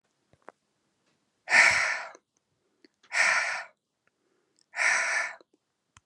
{"exhalation_length": "6.1 s", "exhalation_amplitude": 17135, "exhalation_signal_mean_std_ratio": 0.39, "survey_phase": "beta (2021-08-13 to 2022-03-07)", "age": "18-44", "gender": "Female", "wearing_mask": "No", "symptom_none": true, "smoker_status": "Current smoker (1 to 10 cigarettes per day)", "respiratory_condition_asthma": false, "respiratory_condition_other": false, "recruitment_source": "REACT", "submission_delay": "2 days", "covid_test_result": "Negative", "covid_test_method": "RT-qPCR", "influenza_a_test_result": "Negative", "influenza_b_test_result": "Negative"}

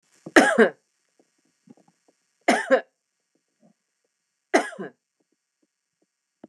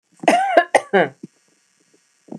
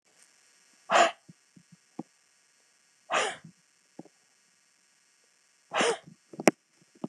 {"three_cough_length": "6.5 s", "three_cough_amplitude": 29204, "three_cough_signal_mean_std_ratio": 0.24, "cough_length": "2.4 s", "cough_amplitude": 29204, "cough_signal_mean_std_ratio": 0.38, "exhalation_length": "7.1 s", "exhalation_amplitude": 29138, "exhalation_signal_mean_std_ratio": 0.24, "survey_phase": "beta (2021-08-13 to 2022-03-07)", "age": "45-64", "gender": "Female", "wearing_mask": "No", "symptom_none": true, "smoker_status": "Never smoked", "respiratory_condition_asthma": false, "respiratory_condition_other": false, "recruitment_source": "REACT", "submission_delay": "1 day", "covid_test_result": "Negative", "covid_test_method": "RT-qPCR"}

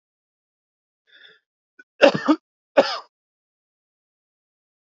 {"cough_length": "4.9 s", "cough_amplitude": 27505, "cough_signal_mean_std_ratio": 0.2, "survey_phase": "alpha (2021-03-01 to 2021-08-12)", "age": "18-44", "gender": "Male", "wearing_mask": "No", "symptom_cough_any": true, "symptom_fatigue": true, "symptom_headache": true, "symptom_change_to_sense_of_smell_or_taste": true, "symptom_onset": "4 days", "smoker_status": "Never smoked", "respiratory_condition_asthma": false, "respiratory_condition_other": false, "recruitment_source": "Test and Trace", "submission_delay": "2 days", "covid_test_result": "Positive", "covid_test_method": "RT-qPCR", "covid_ct_value": 17.4, "covid_ct_gene": "N gene", "covid_ct_mean": 17.8, "covid_viral_load": "1500000 copies/ml", "covid_viral_load_category": "High viral load (>1M copies/ml)"}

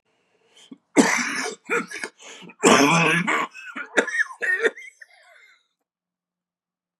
{"cough_length": "7.0 s", "cough_amplitude": 28635, "cough_signal_mean_std_ratio": 0.45, "survey_phase": "beta (2021-08-13 to 2022-03-07)", "age": "45-64", "gender": "Male", "wearing_mask": "No", "symptom_cough_any": true, "symptom_new_continuous_cough": true, "symptom_runny_or_blocked_nose": true, "symptom_shortness_of_breath": true, "symptom_sore_throat": true, "symptom_diarrhoea": true, "symptom_fatigue": true, "symptom_fever_high_temperature": true, "symptom_headache": true, "symptom_change_to_sense_of_smell_or_taste": true, "symptom_loss_of_taste": true, "smoker_status": "Current smoker (1 to 10 cigarettes per day)", "respiratory_condition_asthma": false, "respiratory_condition_other": false, "recruitment_source": "Test and Trace", "submission_delay": "2 days", "covid_test_result": "Positive", "covid_test_method": "RT-qPCR", "covid_ct_value": 19.8, "covid_ct_gene": "ORF1ab gene", "covid_ct_mean": 20.5, "covid_viral_load": "190000 copies/ml", "covid_viral_load_category": "Low viral load (10K-1M copies/ml)"}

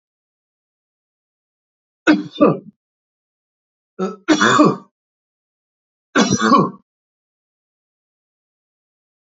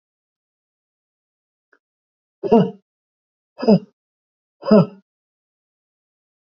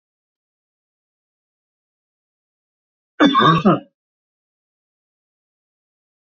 {"three_cough_length": "9.3 s", "three_cough_amplitude": 28133, "three_cough_signal_mean_std_ratio": 0.3, "exhalation_length": "6.6 s", "exhalation_amplitude": 27662, "exhalation_signal_mean_std_ratio": 0.22, "cough_length": "6.4 s", "cough_amplitude": 27995, "cough_signal_mean_std_ratio": 0.23, "survey_phase": "beta (2021-08-13 to 2022-03-07)", "age": "45-64", "gender": "Male", "wearing_mask": "No", "symptom_none": true, "smoker_status": "Never smoked", "respiratory_condition_asthma": false, "respiratory_condition_other": false, "recruitment_source": "REACT", "submission_delay": "2 days", "covid_test_result": "Negative", "covid_test_method": "RT-qPCR", "influenza_a_test_result": "Negative", "influenza_b_test_result": "Negative"}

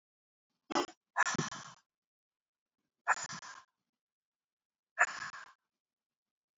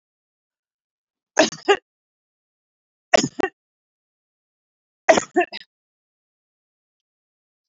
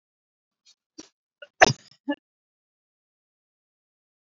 {"exhalation_length": "6.6 s", "exhalation_amplitude": 6185, "exhalation_signal_mean_std_ratio": 0.26, "three_cough_length": "7.7 s", "three_cough_amplitude": 28171, "three_cough_signal_mean_std_ratio": 0.2, "cough_length": "4.3 s", "cough_amplitude": 29461, "cough_signal_mean_std_ratio": 0.12, "survey_phase": "beta (2021-08-13 to 2022-03-07)", "age": "45-64", "gender": "Female", "wearing_mask": "No", "symptom_none": true, "smoker_status": "Ex-smoker", "respiratory_condition_asthma": false, "respiratory_condition_other": false, "recruitment_source": "REACT", "submission_delay": "2 days", "covid_test_result": "Negative", "covid_test_method": "RT-qPCR", "influenza_a_test_result": "Negative", "influenza_b_test_result": "Negative"}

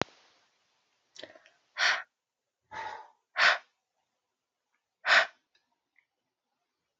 {"exhalation_length": "7.0 s", "exhalation_amplitude": 14562, "exhalation_signal_mean_std_ratio": 0.25, "survey_phase": "beta (2021-08-13 to 2022-03-07)", "age": "18-44", "gender": "Female", "wearing_mask": "No", "symptom_sore_throat": true, "symptom_onset": "4 days", "smoker_status": "Never smoked", "respiratory_condition_asthma": false, "respiratory_condition_other": false, "recruitment_source": "REACT", "submission_delay": "1 day", "covid_test_result": "Negative", "covid_test_method": "RT-qPCR"}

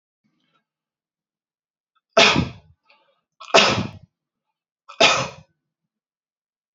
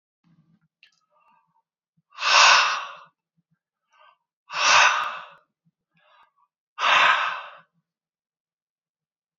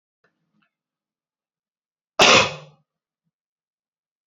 {"three_cough_length": "6.7 s", "three_cough_amplitude": 30592, "three_cough_signal_mean_std_ratio": 0.27, "exhalation_length": "9.4 s", "exhalation_amplitude": 25398, "exhalation_signal_mean_std_ratio": 0.34, "cough_length": "4.3 s", "cough_amplitude": 32768, "cough_signal_mean_std_ratio": 0.21, "survey_phase": "beta (2021-08-13 to 2022-03-07)", "age": "45-64", "gender": "Male", "wearing_mask": "No", "symptom_none": true, "smoker_status": "Never smoked", "respiratory_condition_asthma": false, "respiratory_condition_other": false, "recruitment_source": "REACT", "submission_delay": "1 day", "covid_test_result": "Negative", "covid_test_method": "RT-qPCR", "influenza_a_test_result": "Negative", "influenza_b_test_result": "Negative"}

